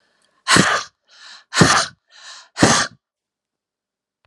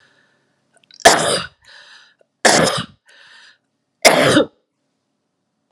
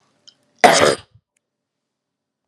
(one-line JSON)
{"exhalation_length": "4.3 s", "exhalation_amplitude": 32768, "exhalation_signal_mean_std_ratio": 0.37, "three_cough_length": "5.7 s", "three_cough_amplitude": 32768, "three_cough_signal_mean_std_ratio": 0.35, "cough_length": "2.5 s", "cough_amplitude": 32768, "cough_signal_mean_std_ratio": 0.27, "survey_phase": "beta (2021-08-13 to 2022-03-07)", "age": "45-64", "gender": "Female", "wearing_mask": "No", "symptom_cough_any": true, "symptom_change_to_sense_of_smell_or_taste": true, "symptom_loss_of_taste": true, "smoker_status": "Never smoked", "respiratory_condition_asthma": false, "respiratory_condition_other": false, "recruitment_source": "Test and Trace", "submission_delay": "2 days", "covid_test_result": "Positive", "covid_test_method": "LFT"}